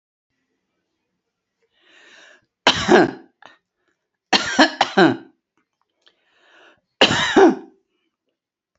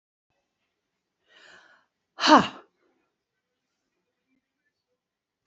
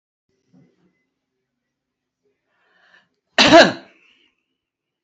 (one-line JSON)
{"three_cough_length": "8.8 s", "three_cough_amplitude": 32767, "three_cough_signal_mean_std_ratio": 0.31, "exhalation_length": "5.5 s", "exhalation_amplitude": 23626, "exhalation_signal_mean_std_ratio": 0.16, "cough_length": "5.0 s", "cough_amplitude": 31309, "cough_signal_mean_std_ratio": 0.2, "survey_phase": "beta (2021-08-13 to 2022-03-07)", "age": "65+", "gender": "Female", "wearing_mask": "No", "symptom_none": true, "smoker_status": "Never smoked", "respiratory_condition_asthma": true, "respiratory_condition_other": false, "recruitment_source": "REACT", "submission_delay": "2 days", "covid_test_result": "Negative", "covid_test_method": "RT-qPCR", "influenza_a_test_result": "Negative", "influenza_b_test_result": "Negative"}